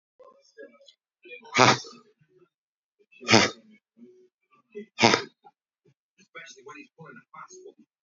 {
  "exhalation_length": "8.0 s",
  "exhalation_amplitude": 32573,
  "exhalation_signal_mean_std_ratio": 0.23,
  "survey_phase": "beta (2021-08-13 to 2022-03-07)",
  "age": "45-64",
  "gender": "Male",
  "wearing_mask": "No",
  "symptom_none": true,
  "smoker_status": "Current smoker (e-cigarettes or vapes only)",
  "respiratory_condition_asthma": true,
  "respiratory_condition_other": true,
  "recruitment_source": "REACT",
  "submission_delay": "1 day",
  "covid_test_result": "Negative",
  "covid_test_method": "RT-qPCR"
}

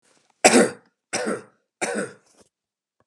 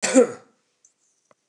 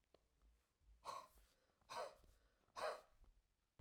{
  "three_cough_length": "3.1 s",
  "three_cough_amplitude": 31731,
  "three_cough_signal_mean_std_ratio": 0.33,
  "cough_length": "1.5 s",
  "cough_amplitude": 24337,
  "cough_signal_mean_std_ratio": 0.3,
  "exhalation_length": "3.8 s",
  "exhalation_amplitude": 649,
  "exhalation_signal_mean_std_ratio": 0.39,
  "survey_phase": "alpha (2021-03-01 to 2021-08-12)",
  "age": "45-64",
  "gender": "Male",
  "wearing_mask": "No",
  "symptom_none": true,
  "smoker_status": "Ex-smoker",
  "respiratory_condition_asthma": false,
  "respiratory_condition_other": false,
  "recruitment_source": "REACT",
  "submission_delay": "1 day",
  "covid_test_result": "Negative",
  "covid_test_method": "RT-qPCR"
}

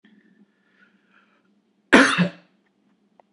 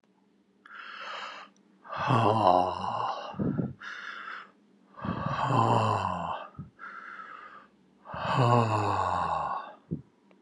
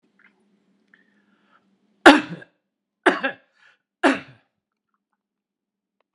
{
  "cough_length": "3.3 s",
  "cough_amplitude": 32767,
  "cough_signal_mean_std_ratio": 0.25,
  "exhalation_length": "10.4 s",
  "exhalation_amplitude": 13740,
  "exhalation_signal_mean_std_ratio": 0.59,
  "three_cough_length": "6.1 s",
  "three_cough_amplitude": 32768,
  "three_cough_signal_mean_std_ratio": 0.19,
  "survey_phase": "beta (2021-08-13 to 2022-03-07)",
  "age": "65+",
  "gender": "Male",
  "wearing_mask": "No",
  "symptom_none": true,
  "smoker_status": "Ex-smoker",
  "respiratory_condition_asthma": false,
  "respiratory_condition_other": false,
  "recruitment_source": "REACT",
  "submission_delay": "3 days",
  "covid_test_result": "Negative",
  "covid_test_method": "RT-qPCR",
  "influenza_a_test_result": "Negative",
  "influenza_b_test_result": "Negative"
}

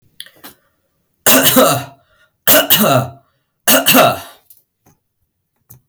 {
  "three_cough_length": "5.9 s",
  "three_cough_amplitude": 32768,
  "three_cough_signal_mean_std_ratio": 0.45,
  "survey_phase": "beta (2021-08-13 to 2022-03-07)",
  "age": "18-44",
  "gender": "Male",
  "wearing_mask": "No",
  "symptom_none": true,
  "smoker_status": "Never smoked",
  "respiratory_condition_asthma": false,
  "respiratory_condition_other": false,
  "recruitment_source": "REACT",
  "submission_delay": "1 day",
  "covid_test_result": "Negative",
  "covid_test_method": "RT-qPCR",
  "influenza_a_test_result": "Negative",
  "influenza_b_test_result": "Negative"
}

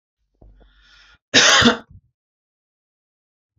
{
  "cough_length": "3.6 s",
  "cough_amplitude": 29775,
  "cough_signal_mean_std_ratio": 0.28,
  "survey_phase": "beta (2021-08-13 to 2022-03-07)",
  "age": "18-44",
  "gender": "Male",
  "wearing_mask": "No",
  "symptom_none": true,
  "smoker_status": "Never smoked",
  "respiratory_condition_asthma": false,
  "respiratory_condition_other": false,
  "recruitment_source": "REACT",
  "submission_delay": "1 day",
  "covid_test_result": "Negative",
  "covid_test_method": "RT-qPCR",
  "influenza_a_test_result": "Negative",
  "influenza_b_test_result": "Negative"
}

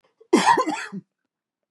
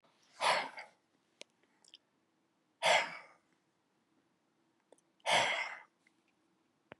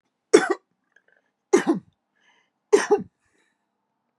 {
  "cough_length": "1.7 s",
  "cough_amplitude": 20404,
  "cough_signal_mean_std_ratio": 0.42,
  "exhalation_length": "7.0 s",
  "exhalation_amplitude": 4813,
  "exhalation_signal_mean_std_ratio": 0.3,
  "three_cough_length": "4.2 s",
  "three_cough_amplitude": 32080,
  "three_cough_signal_mean_std_ratio": 0.27,
  "survey_phase": "beta (2021-08-13 to 2022-03-07)",
  "age": "45-64",
  "gender": "Male",
  "wearing_mask": "No",
  "symptom_none": true,
  "smoker_status": "Never smoked",
  "respiratory_condition_asthma": false,
  "respiratory_condition_other": false,
  "recruitment_source": "REACT",
  "submission_delay": "3 days",
  "covid_test_result": "Negative",
  "covid_test_method": "RT-qPCR",
  "influenza_a_test_result": "Negative",
  "influenza_b_test_result": "Negative"
}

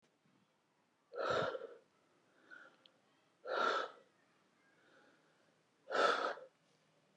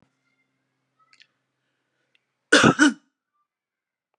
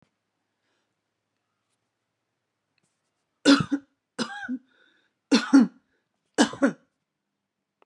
{
  "exhalation_length": "7.2 s",
  "exhalation_amplitude": 3271,
  "exhalation_signal_mean_std_ratio": 0.37,
  "cough_length": "4.2 s",
  "cough_amplitude": 25196,
  "cough_signal_mean_std_ratio": 0.22,
  "three_cough_length": "7.9 s",
  "three_cough_amplitude": 20741,
  "three_cough_signal_mean_std_ratio": 0.25,
  "survey_phase": "beta (2021-08-13 to 2022-03-07)",
  "age": "45-64",
  "gender": "Female",
  "wearing_mask": "No",
  "symptom_none": true,
  "smoker_status": "Ex-smoker",
  "respiratory_condition_asthma": false,
  "respiratory_condition_other": false,
  "recruitment_source": "REACT",
  "submission_delay": "2 days",
  "covid_test_result": "Negative",
  "covid_test_method": "RT-qPCR"
}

